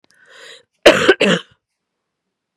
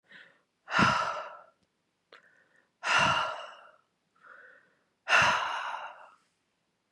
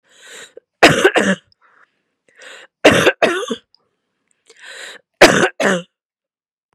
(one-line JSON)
{"cough_length": "2.6 s", "cough_amplitude": 32768, "cough_signal_mean_std_ratio": 0.32, "exhalation_length": "6.9 s", "exhalation_amplitude": 10658, "exhalation_signal_mean_std_ratio": 0.41, "three_cough_length": "6.7 s", "three_cough_amplitude": 32768, "three_cough_signal_mean_std_ratio": 0.36, "survey_phase": "beta (2021-08-13 to 2022-03-07)", "age": "45-64", "gender": "Female", "wearing_mask": "No", "symptom_none": true, "symptom_onset": "12 days", "smoker_status": "Ex-smoker", "respiratory_condition_asthma": false, "respiratory_condition_other": false, "recruitment_source": "REACT", "submission_delay": "6 days", "covid_test_result": "Negative", "covid_test_method": "RT-qPCR", "influenza_a_test_result": "Negative", "influenza_b_test_result": "Negative"}